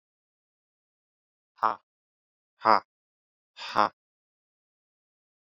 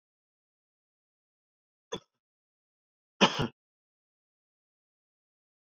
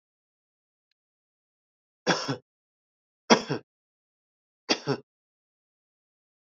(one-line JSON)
{"exhalation_length": "5.5 s", "exhalation_amplitude": 18518, "exhalation_signal_mean_std_ratio": 0.15, "cough_length": "5.6 s", "cough_amplitude": 14093, "cough_signal_mean_std_ratio": 0.14, "three_cough_length": "6.6 s", "three_cough_amplitude": 26284, "three_cough_signal_mean_std_ratio": 0.2, "survey_phase": "beta (2021-08-13 to 2022-03-07)", "age": "18-44", "gender": "Male", "wearing_mask": "No", "symptom_cough_any": true, "symptom_runny_or_blocked_nose": true, "symptom_sore_throat": true, "symptom_diarrhoea": true, "symptom_fatigue": true, "symptom_fever_high_temperature": true, "symptom_headache": true, "smoker_status": "Never smoked", "respiratory_condition_asthma": true, "respiratory_condition_other": false, "recruitment_source": "Test and Trace", "submission_delay": "1 day", "covid_test_result": "Positive", "covid_test_method": "RT-qPCR"}